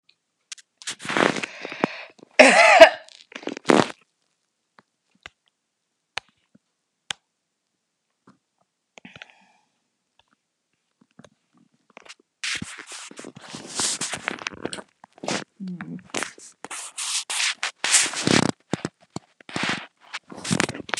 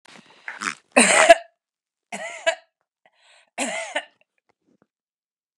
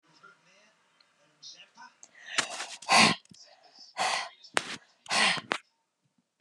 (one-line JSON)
{"cough_length": "21.0 s", "cough_amplitude": 32768, "cough_signal_mean_std_ratio": 0.27, "three_cough_length": "5.6 s", "three_cough_amplitude": 32768, "three_cough_signal_mean_std_ratio": 0.27, "exhalation_length": "6.4 s", "exhalation_amplitude": 20074, "exhalation_signal_mean_std_ratio": 0.33, "survey_phase": "beta (2021-08-13 to 2022-03-07)", "age": "65+", "gender": "Female", "wearing_mask": "No", "symptom_none": true, "smoker_status": "Ex-smoker", "respiratory_condition_asthma": false, "respiratory_condition_other": false, "recruitment_source": "REACT", "submission_delay": "7 days", "covid_test_result": "Negative", "covid_test_method": "RT-qPCR"}